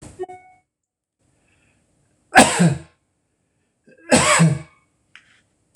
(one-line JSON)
{"cough_length": "5.8 s", "cough_amplitude": 26028, "cough_signal_mean_std_ratio": 0.31, "survey_phase": "beta (2021-08-13 to 2022-03-07)", "age": "65+", "gender": "Male", "wearing_mask": "No", "symptom_none": true, "smoker_status": "Ex-smoker", "respiratory_condition_asthma": false, "respiratory_condition_other": false, "recruitment_source": "REACT", "submission_delay": "2 days", "covid_test_result": "Negative", "covid_test_method": "RT-qPCR"}